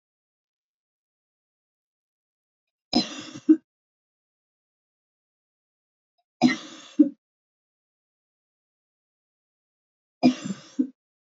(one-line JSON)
{"three_cough_length": "11.3 s", "three_cough_amplitude": 18101, "three_cough_signal_mean_std_ratio": 0.19, "survey_phase": "beta (2021-08-13 to 2022-03-07)", "age": "65+", "gender": "Female", "wearing_mask": "No", "symptom_none": true, "smoker_status": "Never smoked", "respiratory_condition_asthma": false, "respiratory_condition_other": false, "recruitment_source": "REACT", "submission_delay": "1 day", "covid_test_result": "Negative", "covid_test_method": "RT-qPCR"}